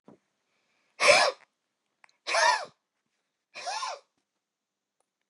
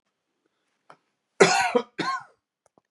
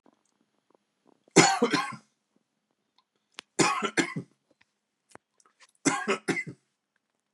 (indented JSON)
{
  "exhalation_length": "5.3 s",
  "exhalation_amplitude": 19262,
  "exhalation_signal_mean_std_ratio": 0.31,
  "cough_length": "2.9 s",
  "cough_amplitude": 26479,
  "cough_signal_mean_std_ratio": 0.32,
  "three_cough_length": "7.3 s",
  "three_cough_amplitude": 23248,
  "three_cough_signal_mean_std_ratio": 0.31,
  "survey_phase": "beta (2021-08-13 to 2022-03-07)",
  "age": "65+",
  "gender": "Male",
  "wearing_mask": "No",
  "symptom_none": true,
  "smoker_status": "Never smoked",
  "respiratory_condition_asthma": false,
  "respiratory_condition_other": false,
  "recruitment_source": "REACT",
  "submission_delay": "1 day",
  "covid_test_result": "Negative",
  "covid_test_method": "RT-qPCR",
  "influenza_a_test_result": "Negative",
  "influenza_b_test_result": "Negative"
}